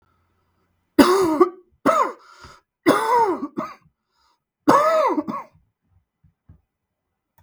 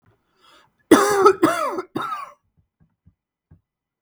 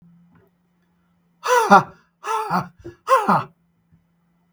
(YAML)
three_cough_length: 7.4 s
three_cough_amplitude: 32768
three_cough_signal_mean_std_ratio: 0.42
cough_length: 4.0 s
cough_amplitude: 32768
cough_signal_mean_std_ratio: 0.35
exhalation_length: 4.5 s
exhalation_amplitude: 32768
exhalation_signal_mean_std_ratio: 0.36
survey_phase: beta (2021-08-13 to 2022-03-07)
age: 45-64
gender: Male
wearing_mask: 'No'
symptom_none: true
smoker_status: Never smoked
respiratory_condition_asthma: false
respiratory_condition_other: false
recruitment_source: REACT
submission_delay: 2 days
covid_test_result: Negative
covid_test_method: RT-qPCR
influenza_a_test_result: Negative
influenza_b_test_result: Negative